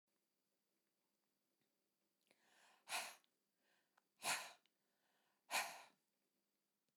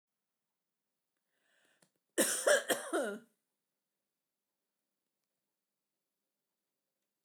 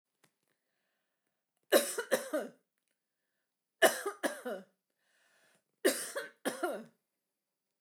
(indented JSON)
{
  "exhalation_length": "7.0 s",
  "exhalation_amplitude": 1240,
  "exhalation_signal_mean_std_ratio": 0.25,
  "cough_length": "7.2 s",
  "cough_amplitude": 5694,
  "cough_signal_mean_std_ratio": 0.24,
  "three_cough_length": "7.8 s",
  "three_cough_amplitude": 9455,
  "three_cough_signal_mean_std_ratio": 0.3,
  "survey_phase": "beta (2021-08-13 to 2022-03-07)",
  "age": "65+",
  "gender": "Female",
  "wearing_mask": "No",
  "symptom_none": true,
  "smoker_status": "Never smoked",
  "respiratory_condition_asthma": false,
  "respiratory_condition_other": false,
  "recruitment_source": "REACT",
  "submission_delay": "2 days",
  "covid_test_result": "Negative",
  "covid_test_method": "RT-qPCR",
  "influenza_a_test_result": "Unknown/Void",
  "influenza_b_test_result": "Unknown/Void"
}